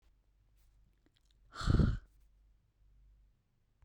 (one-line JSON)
{"exhalation_length": "3.8 s", "exhalation_amplitude": 4033, "exhalation_signal_mean_std_ratio": 0.26, "survey_phase": "beta (2021-08-13 to 2022-03-07)", "age": "18-44", "gender": "Female", "wearing_mask": "Yes", "symptom_sore_throat": true, "smoker_status": "Current smoker (1 to 10 cigarettes per day)", "respiratory_condition_asthma": false, "respiratory_condition_other": false, "recruitment_source": "REACT", "submission_delay": "0 days", "covid_test_result": "Negative", "covid_test_method": "RT-qPCR", "influenza_a_test_result": "Negative", "influenza_b_test_result": "Negative"}